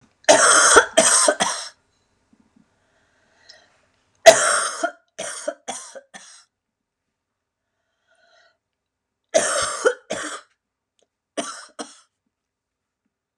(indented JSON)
{
  "three_cough_length": "13.4 s",
  "three_cough_amplitude": 32768,
  "three_cough_signal_mean_std_ratio": 0.31,
  "survey_phase": "beta (2021-08-13 to 2022-03-07)",
  "age": "45-64",
  "gender": "Female",
  "wearing_mask": "No",
  "symptom_cough_any": true,
  "symptom_new_continuous_cough": true,
  "symptom_sore_throat": true,
  "symptom_abdominal_pain": true,
  "symptom_diarrhoea": true,
  "symptom_fatigue": true,
  "symptom_fever_high_temperature": true,
  "symptom_headache": true,
  "symptom_onset": "3 days",
  "smoker_status": "Never smoked",
  "respiratory_condition_asthma": true,
  "respiratory_condition_other": false,
  "recruitment_source": "Test and Trace",
  "submission_delay": "1 day",
  "covid_test_result": "Negative",
  "covid_test_method": "RT-qPCR"
}